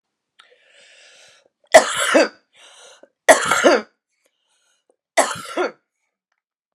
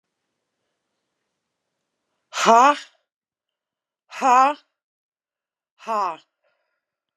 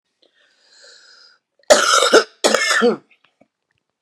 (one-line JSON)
{"three_cough_length": "6.7 s", "three_cough_amplitude": 32768, "three_cough_signal_mean_std_ratio": 0.31, "exhalation_length": "7.2 s", "exhalation_amplitude": 28071, "exhalation_signal_mean_std_ratio": 0.25, "cough_length": "4.0 s", "cough_amplitude": 32768, "cough_signal_mean_std_ratio": 0.39, "survey_phase": "beta (2021-08-13 to 2022-03-07)", "age": "45-64", "gender": "Female", "wearing_mask": "No", "symptom_none": true, "smoker_status": "Current smoker (1 to 10 cigarettes per day)", "respiratory_condition_asthma": false, "respiratory_condition_other": false, "recruitment_source": "REACT", "submission_delay": "0 days", "covid_test_result": "Negative", "covid_test_method": "RT-qPCR", "influenza_a_test_result": "Negative", "influenza_b_test_result": "Negative"}